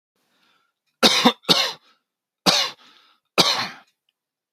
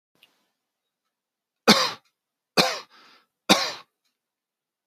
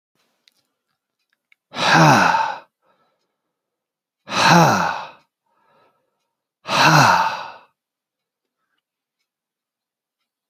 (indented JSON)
{
  "cough_length": "4.5 s",
  "cough_amplitude": 32768,
  "cough_signal_mean_std_ratio": 0.36,
  "three_cough_length": "4.9 s",
  "three_cough_amplitude": 29557,
  "three_cough_signal_mean_std_ratio": 0.25,
  "exhalation_length": "10.5 s",
  "exhalation_amplitude": 32768,
  "exhalation_signal_mean_std_ratio": 0.35,
  "survey_phase": "alpha (2021-03-01 to 2021-08-12)",
  "age": "18-44",
  "gender": "Male",
  "wearing_mask": "No",
  "symptom_none": true,
  "smoker_status": "Never smoked",
  "respiratory_condition_asthma": false,
  "respiratory_condition_other": false,
  "recruitment_source": "REACT",
  "submission_delay": "1 day",
  "covid_test_result": "Negative",
  "covid_test_method": "RT-qPCR"
}